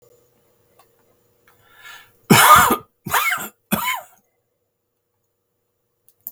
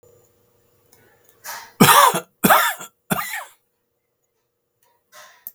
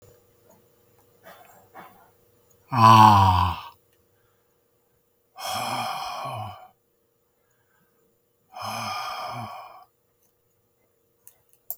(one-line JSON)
{"three_cough_length": "6.3 s", "three_cough_amplitude": 32768, "three_cough_signal_mean_std_ratio": 0.3, "cough_length": "5.5 s", "cough_amplitude": 32768, "cough_signal_mean_std_ratio": 0.31, "exhalation_length": "11.8 s", "exhalation_amplitude": 31617, "exhalation_signal_mean_std_ratio": 0.28, "survey_phase": "beta (2021-08-13 to 2022-03-07)", "age": "65+", "gender": "Male", "wearing_mask": "No", "symptom_none": true, "smoker_status": "Never smoked", "respiratory_condition_asthma": false, "respiratory_condition_other": false, "recruitment_source": "REACT", "submission_delay": "3 days", "covid_test_result": "Negative", "covid_test_method": "RT-qPCR", "influenza_a_test_result": "Negative", "influenza_b_test_result": "Negative"}